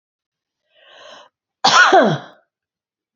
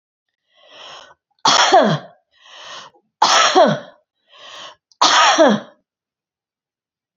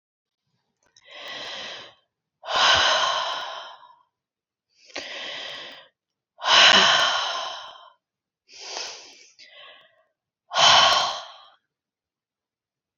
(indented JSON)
{
  "cough_length": "3.2 s",
  "cough_amplitude": 32316,
  "cough_signal_mean_std_ratio": 0.34,
  "three_cough_length": "7.2 s",
  "three_cough_amplitude": 32767,
  "three_cough_signal_mean_std_ratio": 0.42,
  "exhalation_length": "13.0 s",
  "exhalation_amplitude": 27396,
  "exhalation_signal_mean_std_ratio": 0.39,
  "survey_phase": "beta (2021-08-13 to 2022-03-07)",
  "age": "45-64",
  "gender": "Female",
  "wearing_mask": "No",
  "symptom_none": true,
  "smoker_status": "Never smoked",
  "respiratory_condition_asthma": false,
  "respiratory_condition_other": false,
  "recruitment_source": "REACT",
  "submission_delay": "2 days",
  "covid_test_result": "Negative",
  "covid_test_method": "RT-qPCR"
}